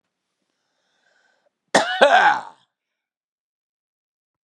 {"cough_length": "4.4 s", "cough_amplitude": 32375, "cough_signal_mean_std_ratio": 0.28, "survey_phase": "beta (2021-08-13 to 2022-03-07)", "age": "65+", "gender": "Male", "wearing_mask": "No", "symptom_none": true, "smoker_status": "Never smoked", "respiratory_condition_asthma": false, "respiratory_condition_other": false, "recruitment_source": "REACT", "submission_delay": "1 day", "covid_test_result": "Negative", "covid_test_method": "RT-qPCR", "influenza_a_test_result": "Negative", "influenza_b_test_result": "Negative"}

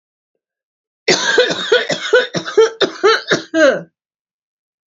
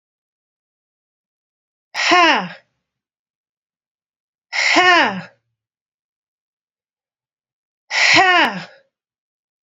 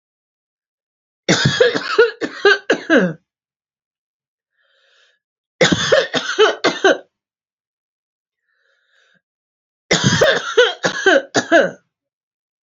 {"cough_length": "4.9 s", "cough_amplitude": 30521, "cough_signal_mean_std_ratio": 0.51, "exhalation_length": "9.6 s", "exhalation_amplitude": 29635, "exhalation_signal_mean_std_ratio": 0.33, "three_cough_length": "12.6 s", "three_cough_amplitude": 32105, "three_cough_signal_mean_std_ratio": 0.42, "survey_phase": "beta (2021-08-13 to 2022-03-07)", "age": "18-44", "gender": "Female", "wearing_mask": "No", "symptom_runny_or_blocked_nose": true, "symptom_shortness_of_breath": true, "symptom_abdominal_pain": true, "symptom_diarrhoea": true, "symptom_fatigue": true, "symptom_headache": true, "symptom_onset": "12 days", "smoker_status": "Ex-smoker", "respiratory_condition_asthma": true, "respiratory_condition_other": false, "recruitment_source": "REACT", "submission_delay": "2 days", "covid_test_result": "Negative", "covid_test_method": "RT-qPCR", "influenza_a_test_result": "Negative", "influenza_b_test_result": "Negative"}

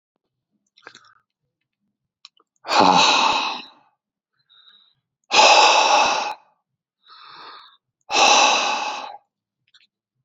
{"exhalation_length": "10.2 s", "exhalation_amplitude": 29813, "exhalation_signal_mean_std_ratio": 0.42, "survey_phase": "beta (2021-08-13 to 2022-03-07)", "age": "45-64", "gender": "Male", "wearing_mask": "No", "symptom_cough_any": true, "smoker_status": "Current smoker (11 or more cigarettes per day)", "respiratory_condition_asthma": false, "respiratory_condition_other": false, "recruitment_source": "REACT", "submission_delay": "2 days", "covid_test_result": "Negative", "covid_test_method": "RT-qPCR", "influenza_a_test_result": "Negative", "influenza_b_test_result": "Negative"}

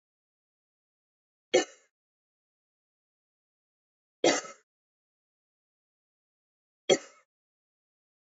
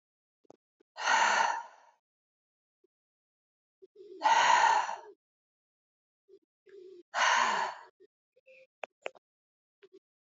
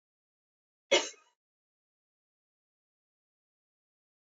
{"three_cough_length": "8.3 s", "three_cough_amplitude": 11057, "three_cough_signal_mean_std_ratio": 0.15, "exhalation_length": "10.2 s", "exhalation_amplitude": 7407, "exhalation_signal_mean_std_ratio": 0.36, "cough_length": "4.3 s", "cough_amplitude": 7892, "cough_signal_mean_std_ratio": 0.13, "survey_phase": "alpha (2021-03-01 to 2021-08-12)", "age": "45-64", "gender": "Female", "wearing_mask": "Yes", "symptom_cough_any": true, "symptom_fatigue": true, "symptom_fever_high_temperature": true, "symptom_headache": true, "symptom_onset": "3 days", "smoker_status": "Ex-smoker", "respiratory_condition_asthma": false, "respiratory_condition_other": false, "recruitment_source": "Test and Trace", "submission_delay": "2 days", "covid_test_result": "Positive", "covid_test_method": "RT-qPCR", "covid_ct_value": 18.8, "covid_ct_gene": "N gene", "covid_ct_mean": 18.9, "covid_viral_load": "620000 copies/ml", "covid_viral_load_category": "Low viral load (10K-1M copies/ml)"}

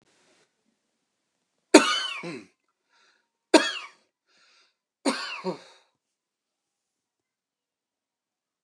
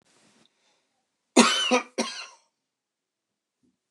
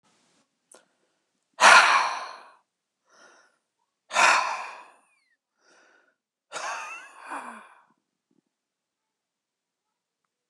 {"three_cough_length": "8.6 s", "three_cough_amplitude": 29204, "three_cough_signal_mean_std_ratio": 0.2, "cough_length": "3.9 s", "cough_amplitude": 26749, "cough_signal_mean_std_ratio": 0.27, "exhalation_length": "10.5 s", "exhalation_amplitude": 29203, "exhalation_signal_mean_std_ratio": 0.25, "survey_phase": "beta (2021-08-13 to 2022-03-07)", "age": "18-44", "gender": "Male", "wearing_mask": "No", "symptom_cough_any": true, "symptom_shortness_of_breath": true, "symptom_onset": "11 days", "smoker_status": "Ex-smoker", "respiratory_condition_asthma": true, "respiratory_condition_other": false, "recruitment_source": "REACT", "submission_delay": "2 days", "covid_test_result": "Negative", "covid_test_method": "RT-qPCR"}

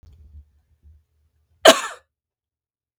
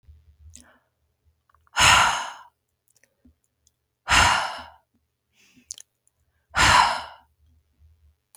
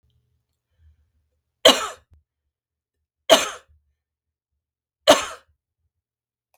{"cough_length": "3.0 s", "cough_amplitude": 32768, "cough_signal_mean_std_ratio": 0.17, "exhalation_length": "8.4 s", "exhalation_amplitude": 29494, "exhalation_signal_mean_std_ratio": 0.32, "three_cough_length": "6.6 s", "three_cough_amplitude": 32766, "three_cough_signal_mean_std_ratio": 0.2, "survey_phase": "beta (2021-08-13 to 2022-03-07)", "age": "45-64", "gender": "Female", "wearing_mask": "No", "symptom_none": true, "smoker_status": "Never smoked", "respiratory_condition_asthma": false, "respiratory_condition_other": false, "recruitment_source": "REACT", "submission_delay": "1 day", "covid_test_result": "Negative", "covid_test_method": "RT-qPCR", "influenza_a_test_result": "Negative", "influenza_b_test_result": "Negative"}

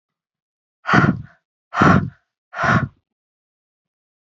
{"exhalation_length": "4.4 s", "exhalation_amplitude": 29613, "exhalation_signal_mean_std_ratio": 0.35, "survey_phase": "beta (2021-08-13 to 2022-03-07)", "age": "45-64", "gender": "Female", "wearing_mask": "No", "symptom_abdominal_pain": true, "symptom_headache": true, "smoker_status": "Ex-smoker", "respiratory_condition_asthma": false, "respiratory_condition_other": false, "recruitment_source": "Test and Trace", "submission_delay": "0 days", "covid_test_result": "Negative", "covid_test_method": "LFT"}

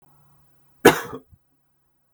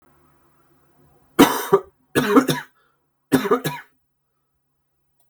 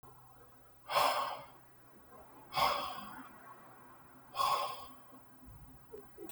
{"cough_length": "2.1 s", "cough_amplitude": 32768, "cough_signal_mean_std_ratio": 0.19, "three_cough_length": "5.3 s", "three_cough_amplitude": 32768, "three_cough_signal_mean_std_ratio": 0.32, "exhalation_length": "6.3 s", "exhalation_amplitude": 4440, "exhalation_signal_mean_std_ratio": 0.49, "survey_phase": "beta (2021-08-13 to 2022-03-07)", "age": "18-44", "gender": "Male", "wearing_mask": "No", "symptom_cough_any": true, "symptom_runny_or_blocked_nose": true, "symptom_onset": "4 days", "smoker_status": "Never smoked", "respiratory_condition_asthma": false, "respiratory_condition_other": false, "recruitment_source": "Test and Trace", "submission_delay": "1 day", "covid_test_result": "Positive", "covid_test_method": "RT-qPCR"}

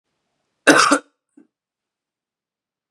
{"cough_length": "2.9 s", "cough_amplitude": 32768, "cough_signal_mean_std_ratio": 0.25, "survey_phase": "beta (2021-08-13 to 2022-03-07)", "age": "18-44", "gender": "Male", "wearing_mask": "No", "symptom_sore_throat": true, "symptom_onset": "5 days", "smoker_status": "Never smoked", "respiratory_condition_asthma": false, "respiratory_condition_other": false, "recruitment_source": "Test and Trace", "submission_delay": "1 day", "covid_test_result": "Positive", "covid_test_method": "RT-qPCR", "covid_ct_value": 19.9, "covid_ct_gene": "N gene", "covid_ct_mean": 20.2, "covid_viral_load": "240000 copies/ml", "covid_viral_load_category": "Low viral load (10K-1M copies/ml)"}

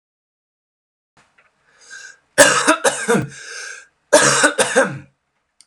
{"cough_length": "5.7 s", "cough_amplitude": 32768, "cough_signal_mean_std_ratio": 0.41, "survey_phase": "alpha (2021-03-01 to 2021-08-12)", "age": "18-44", "gender": "Male", "wearing_mask": "No", "symptom_cough_any": true, "symptom_new_continuous_cough": true, "symptom_diarrhoea": true, "symptom_fatigue": true, "symptom_fever_high_temperature": true, "symptom_headache": true, "symptom_onset": "7 days", "smoker_status": "Never smoked", "respiratory_condition_asthma": false, "respiratory_condition_other": false, "recruitment_source": "Test and Trace", "submission_delay": "2 days", "covid_test_result": "Positive", "covid_test_method": "RT-qPCR", "covid_ct_value": 16.0, "covid_ct_gene": "ORF1ab gene", "covid_ct_mean": 16.5, "covid_viral_load": "4000000 copies/ml", "covid_viral_load_category": "High viral load (>1M copies/ml)"}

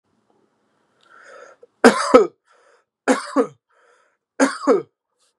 {"three_cough_length": "5.4 s", "three_cough_amplitude": 32768, "three_cough_signal_mean_std_ratio": 0.3, "survey_phase": "beta (2021-08-13 to 2022-03-07)", "age": "18-44", "gender": "Male", "wearing_mask": "No", "symptom_sore_throat": true, "symptom_fatigue": true, "symptom_onset": "3 days", "smoker_status": "Never smoked", "respiratory_condition_asthma": false, "respiratory_condition_other": false, "recruitment_source": "Test and Trace", "submission_delay": "2 days", "covid_test_result": "Positive", "covid_test_method": "RT-qPCR"}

